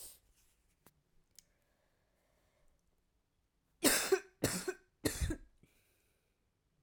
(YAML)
three_cough_length: 6.8 s
three_cough_amplitude: 6138
three_cough_signal_mean_std_ratio: 0.27
survey_phase: beta (2021-08-13 to 2022-03-07)
age: 18-44
gender: Female
wearing_mask: 'No'
symptom_cough_any: true
symptom_new_continuous_cough: true
symptom_runny_or_blocked_nose: true
symptom_change_to_sense_of_smell_or_taste: true
symptom_loss_of_taste: true
symptom_onset: 2 days
smoker_status: Never smoked
respiratory_condition_asthma: false
respiratory_condition_other: false
recruitment_source: Test and Trace
submission_delay: 1 day
covid_test_result: Positive
covid_test_method: RT-qPCR